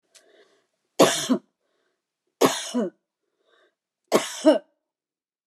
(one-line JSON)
{"three_cough_length": "5.5 s", "three_cough_amplitude": 27045, "three_cough_signal_mean_std_ratio": 0.31, "survey_phase": "beta (2021-08-13 to 2022-03-07)", "age": "45-64", "gender": "Female", "wearing_mask": "No", "symptom_sore_throat": true, "symptom_headache": true, "smoker_status": "Never smoked", "respiratory_condition_asthma": false, "respiratory_condition_other": false, "recruitment_source": "REACT", "submission_delay": "3 days", "covid_test_result": "Negative", "covid_test_method": "RT-qPCR"}